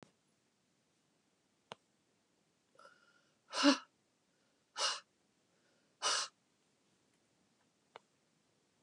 {
  "exhalation_length": "8.8 s",
  "exhalation_amplitude": 5608,
  "exhalation_signal_mean_std_ratio": 0.21,
  "survey_phase": "beta (2021-08-13 to 2022-03-07)",
  "age": "65+",
  "gender": "Female",
  "wearing_mask": "No",
  "symptom_none": true,
  "smoker_status": "Ex-smoker",
  "respiratory_condition_asthma": false,
  "respiratory_condition_other": false,
  "recruitment_source": "REACT",
  "submission_delay": "2 days",
  "covid_test_result": "Negative",
  "covid_test_method": "RT-qPCR"
}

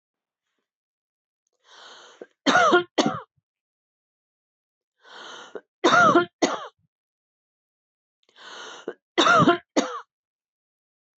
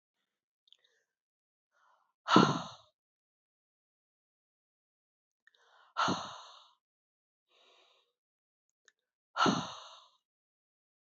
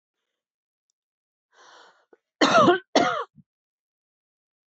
{
  "three_cough_length": "11.2 s",
  "three_cough_amplitude": 18824,
  "three_cough_signal_mean_std_ratio": 0.32,
  "exhalation_length": "11.2 s",
  "exhalation_amplitude": 12045,
  "exhalation_signal_mean_std_ratio": 0.21,
  "cough_length": "4.7 s",
  "cough_amplitude": 18087,
  "cough_signal_mean_std_ratio": 0.29,
  "survey_phase": "beta (2021-08-13 to 2022-03-07)",
  "age": "45-64",
  "gender": "Female",
  "wearing_mask": "No",
  "symptom_none": true,
  "smoker_status": "Never smoked",
  "respiratory_condition_asthma": false,
  "respiratory_condition_other": false,
  "recruitment_source": "REACT",
  "submission_delay": "1 day",
  "covid_test_result": "Negative",
  "covid_test_method": "RT-qPCR",
  "influenza_a_test_result": "Unknown/Void",
  "influenza_b_test_result": "Unknown/Void"
}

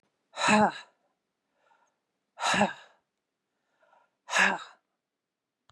{
  "exhalation_length": "5.7 s",
  "exhalation_amplitude": 12085,
  "exhalation_signal_mean_std_ratio": 0.31,
  "survey_phase": "beta (2021-08-13 to 2022-03-07)",
  "age": "65+",
  "gender": "Female",
  "wearing_mask": "No",
  "symptom_none": true,
  "smoker_status": "Never smoked",
  "respiratory_condition_asthma": false,
  "respiratory_condition_other": false,
  "recruitment_source": "REACT",
  "submission_delay": "2 days",
  "covid_test_result": "Negative",
  "covid_test_method": "RT-qPCR",
  "influenza_a_test_result": "Negative",
  "influenza_b_test_result": "Negative"
}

